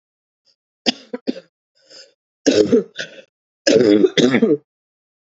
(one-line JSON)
{"three_cough_length": "5.3 s", "three_cough_amplitude": 30309, "three_cough_signal_mean_std_ratio": 0.4, "survey_phase": "beta (2021-08-13 to 2022-03-07)", "age": "18-44", "gender": "Female", "wearing_mask": "No", "symptom_cough_any": true, "symptom_runny_or_blocked_nose": true, "symptom_sore_throat": true, "symptom_headache": true, "symptom_onset": "2 days", "smoker_status": "Ex-smoker", "respiratory_condition_asthma": false, "respiratory_condition_other": false, "recruitment_source": "Test and Trace", "submission_delay": "2 days", "covid_test_result": "Positive", "covid_test_method": "RT-qPCR", "covid_ct_value": 18.2, "covid_ct_gene": "ORF1ab gene", "covid_ct_mean": 18.4, "covid_viral_load": "940000 copies/ml", "covid_viral_load_category": "Low viral load (10K-1M copies/ml)"}